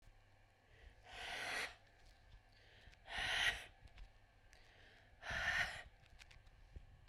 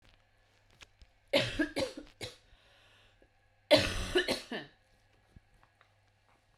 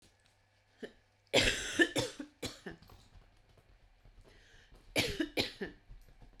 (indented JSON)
{
  "exhalation_length": "7.1 s",
  "exhalation_amplitude": 1786,
  "exhalation_signal_mean_std_ratio": 0.48,
  "three_cough_length": "6.6 s",
  "three_cough_amplitude": 13121,
  "three_cough_signal_mean_std_ratio": 0.32,
  "cough_length": "6.4 s",
  "cough_amplitude": 8003,
  "cough_signal_mean_std_ratio": 0.36,
  "survey_phase": "beta (2021-08-13 to 2022-03-07)",
  "age": "18-44",
  "gender": "Female",
  "wearing_mask": "No",
  "symptom_cough_any": true,
  "symptom_sore_throat": true,
  "symptom_headache": true,
  "symptom_change_to_sense_of_smell_or_taste": true,
  "symptom_loss_of_taste": true,
  "symptom_onset": "7 days",
  "smoker_status": "Never smoked",
  "respiratory_condition_asthma": false,
  "respiratory_condition_other": false,
  "recruitment_source": "REACT",
  "submission_delay": "1 day",
  "covid_test_result": "Negative",
  "covid_test_method": "RT-qPCR"
}